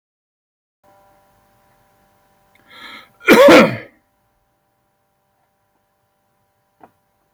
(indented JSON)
{
  "cough_length": "7.3 s",
  "cough_amplitude": 30084,
  "cough_signal_mean_std_ratio": 0.22,
  "survey_phase": "beta (2021-08-13 to 2022-03-07)",
  "age": "45-64",
  "gender": "Male",
  "wearing_mask": "No",
  "symptom_none": true,
  "smoker_status": "Ex-smoker",
  "respiratory_condition_asthma": false,
  "respiratory_condition_other": false,
  "recruitment_source": "REACT",
  "submission_delay": "2 days",
  "covid_test_result": "Negative",
  "covid_test_method": "RT-qPCR"
}